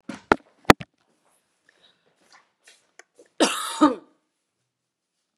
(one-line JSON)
{"cough_length": "5.4 s", "cough_amplitude": 32768, "cough_signal_mean_std_ratio": 0.19, "survey_phase": "beta (2021-08-13 to 2022-03-07)", "age": "45-64", "gender": "Female", "wearing_mask": "No", "symptom_none": true, "smoker_status": "Ex-smoker", "respiratory_condition_asthma": false, "respiratory_condition_other": false, "recruitment_source": "REACT", "submission_delay": "3 days", "covid_test_result": "Negative", "covid_test_method": "RT-qPCR", "influenza_a_test_result": "Negative", "influenza_b_test_result": "Negative"}